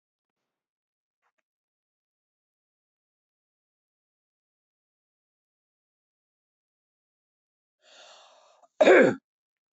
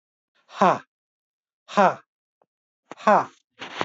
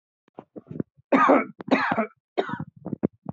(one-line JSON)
{"cough_length": "9.7 s", "cough_amplitude": 17150, "cough_signal_mean_std_ratio": 0.15, "exhalation_length": "3.8 s", "exhalation_amplitude": 20524, "exhalation_signal_mean_std_ratio": 0.28, "three_cough_length": "3.3 s", "three_cough_amplitude": 18091, "three_cough_signal_mean_std_ratio": 0.42, "survey_phase": "alpha (2021-03-01 to 2021-08-12)", "age": "45-64", "gender": "Female", "wearing_mask": "No", "symptom_none": true, "smoker_status": "Ex-smoker", "respiratory_condition_asthma": false, "respiratory_condition_other": false, "recruitment_source": "Test and Trace", "submission_delay": "1 day", "covid_test_method": "RT-qPCR"}